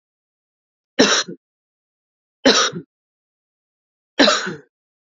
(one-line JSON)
{"three_cough_length": "5.1 s", "three_cough_amplitude": 32768, "three_cough_signal_mean_std_ratio": 0.31, "survey_phase": "alpha (2021-03-01 to 2021-08-12)", "age": "18-44", "gender": "Female", "wearing_mask": "No", "symptom_change_to_sense_of_smell_or_taste": true, "symptom_loss_of_taste": true, "symptom_onset": "2 days", "smoker_status": "Never smoked", "respiratory_condition_asthma": false, "respiratory_condition_other": false, "recruitment_source": "Test and Trace", "submission_delay": "2 days", "covid_test_result": "Positive", "covid_test_method": "RT-qPCR"}